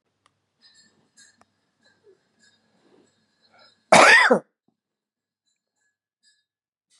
cough_length: 7.0 s
cough_amplitude: 30429
cough_signal_mean_std_ratio: 0.21
survey_phase: beta (2021-08-13 to 2022-03-07)
age: 45-64
gender: Male
wearing_mask: 'No'
symptom_none: true
symptom_onset: 12 days
smoker_status: Ex-smoker
respiratory_condition_asthma: true
respiratory_condition_other: false
recruitment_source: REACT
submission_delay: 4 days
covid_test_result: Negative
covid_test_method: RT-qPCR
influenza_a_test_result: Negative
influenza_b_test_result: Negative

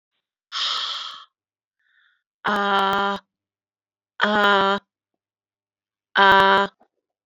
exhalation_length: 7.3 s
exhalation_amplitude: 28807
exhalation_signal_mean_std_ratio: 0.39
survey_phase: alpha (2021-03-01 to 2021-08-12)
age: 45-64
gender: Female
wearing_mask: 'No'
symptom_cough_any: true
symptom_fatigue: true
symptom_change_to_sense_of_smell_or_taste: true
symptom_onset: 5 days
smoker_status: Never smoked
respiratory_condition_asthma: false
respiratory_condition_other: false
recruitment_source: Test and Trace
submission_delay: 2 days
covid_test_result: Positive
covid_test_method: RT-qPCR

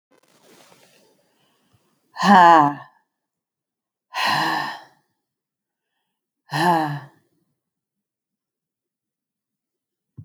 exhalation_length: 10.2 s
exhalation_amplitude: 27367
exhalation_signal_mean_std_ratio: 0.27
survey_phase: alpha (2021-03-01 to 2021-08-12)
age: 65+
gender: Female
wearing_mask: 'No'
symptom_none: true
smoker_status: Ex-smoker
respiratory_condition_asthma: false
respiratory_condition_other: false
recruitment_source: REACT
submission_delay: 1 day
covid_test_result: Negative
covid_test_method: RT-qPCR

